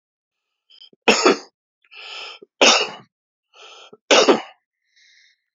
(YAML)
three_cough_length: 5.5 s
three_cough_amplitude: 31870
three_cough_signal_mean_std_ratio: 0.32
survey_phase: beta (2021-08-13 to 2022-03-07)
age: 65+
gender: Male
wearing_mask: 'No'
symptom_cough_any: true
smoker_status: Ex-smoker
respiratory_condition_asthma: false
respiratory_condition_other: false
recruitment_source: REACT
submission_delay: 2 days
covid_test_result: Negative
covid_test_method: RT-qPCR